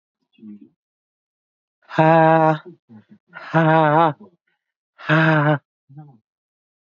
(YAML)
exhalation_length: 6.8 s
exhalation_amplitude: 27668
exhalation_signal_mean_std_ratio: 0.41
survey_phase: beta (2021-08-13 to 2022-03-07)
age: 45-64
gender: Female
wearing_mask: 'No'
symptom_runny_or_blocked_nose: true
symptom_abdominal_pain: true
symptom_fatigue: true
symptom_headache: true
symptom_change_to_sense_of_smell_or_taste: true
smoker_status: Ex-smoker
respiratory_condition_asthma: true
respiratory_condition_other: false
recruitment_source: REACT
submission_delay: 3 days
covid_test_result: Negative
covid_test_method: RT-qPCR
influenza_a_test_result: Negative
influenza_b_test_result: Negative